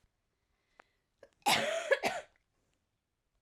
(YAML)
cough_length: 3.4 s
cough_amplitude: 5678
cough_signal_mean_std_ratio: 0.33
survey_phase: alpha (2021-03-01 to 2021-08-12)
age: 18-44
gender: Female
wearing_mask: 'No'
symptom_cough_any: true
symptom_new_continuous_cough: true
symptom_fatigue: true
symptom_fever_high_temperature: true
symptom_headache: true
symptom_change_to_sense_of_smell_or_taste: true
symptom_loss_of_taste: true
symptom_onset: 4 days
smoker_status: Never smoked
respiratory_condition_asthma: false
respiratory_condition_other: false
recruitment_source: Test and Trace
submission_delay: 2 days
covid_test_result: Positive
covid_test_method: RT-qPCR
covid_ct_value: 14.1
covid_ct_gene: S gene
covid_ct_mean: 14.3
covid_viral_load: 20000000 copies/ml
covid_viral_load_category: High viral load (>1M copies/ml)